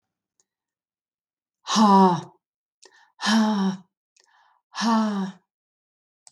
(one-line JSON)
{"exhalation_length": "6.3 s", "exhalation_amplitude": 18405, "exhalation_signal_mean_std_ratio": 0.41, "survey_phase": "beta (2021-08-13 to 2022-03-07)", "age": "45-64", "gender": "Female", "wearing_mask": "No", "symptom_none": true, "symptom_onset": "11 days", "smoker_status": "Ex-smoker", "respiratory_condition_asthma": false, "respiratory_condition_other": false, "recruitment_source": "REACT", "submission_delay": "3 days", "covid_test_result": "Negative", "covid_test_method": "RT-qPCR", "influenza_a_test_result": "Negative", "influenza_b_test_result": "Negative"}